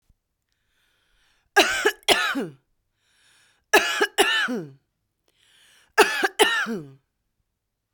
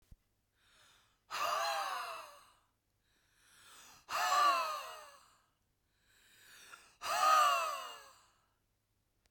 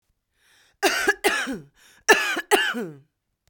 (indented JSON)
{
  "three_cough_length": "7.9 s",
  "three_cough_amplitude": 32767,
  "three_cough_signal_mean_std_ratio": 0.38,
  "exhalation_length": "9.3 s",
  "exhalation_amplitude": 4226,
  "exhalation_signal_mean_std_ratio": 0.42,
  "cough_length": "3.5 s",
  "cough_amplitude": 28105,
  "cough_signal_mean_std_ratio": 0.45,
  "survey_phase": "beta (2021-08-13 to 2022-03-07)",
  "age": "18-44",
  "gender": "Female",
  "wearing_mask": "No",
  "symptom_fatigue": true,
  "symptom_onset": "5 days",
  "smoker_status": "Current smoker (1 to 10 cigarettes per day)",
  "respiratory_condition_asthma": true,
  "respiratory_condition_other": false,
  "recruitment_source": "REACT",
  "submission_delay": "0 days",
  "covid_test_result": "Negative",
  "covid_test_method": "RT-qPCR",
  "influenza_a_test_result": "Unknown/Void",
  "influenza_b_test_result": "Unknown/Void"
}